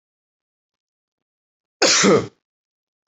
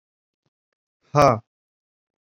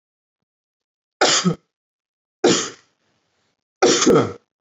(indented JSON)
{
  "cough_length": "3.1 s",
  "cough_amplitude": 28261,
  "cough_signal_mean_std_ratio": 0.3,
  "exhalation_length": "2.3 s",
  "exhalation_amplitude": 27757,
  "exhalation_signal_mean_std_ratio": 0.21,
  "three_cough_length": "4.6 s",
  "three_cough_amplitude": 24909,
  "three_cough_signal_mean_std_ratio": 0.38,
  "survey_phase": "alpha (2021-03-01 to 2021-08-12)",
  "age": "18-44",
  "gender": "Male",
  "wearing_mask": "No",
  "symptom_none": true,
  "smoker_status": "Never smoked",
  "respiratory_condition_asthma": false,
  "respiratory_condition_other": false,
  "recruitment_source": "REACT",
  "submission_delay": "1 day",
  "covid_test_result": "Negative",
  "covid_test_method": "RT-qPCR"
}